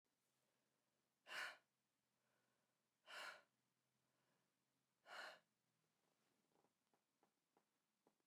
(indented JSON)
{
  "exhalation_length": "8.3 s",
  "exhalation_amplitude": 358,
  "exhalation_signal_mean_std_ratio": 0.28,
  "survey_phase": "beta (2021-08-13 to 2022-03-07)",
  "age": "45-64",
  "gender": "Female",
  "wearing_mask": "No",
  "symptom_cough_any": true,
  "symptom_runny_or_blocked_nose": true,
  "symptom_sore_throat": true,
  "symptom_fatigue": true,
  "symptom_fever_high_temperature": true,
  "symptom_headache": true,
  "symptom_change_to_sense_of_smell_or_taste": true,
  "symptom_onset": "5 days",
  "smoker_status": "Ex-smoker",
  "respiratory_condition_asthma": false,
  "respiratory_condition_other": false,
  "recruitment_source": "Test and Trace",
  "submission_delay": "1 day",
  "covid_test_result": "Positive",
  "covid_test_method": "RT-qPCR",
  "covid_ct_value": 13.4,
  "covid_ct_gene": "ORF1ab gene",
  "covid_ct_mean": 14.0,
  "covid_viral_load": "26000000 copies/ml",
  "covid_viral_load_category": "High viral load (>1M copies/ml)"
}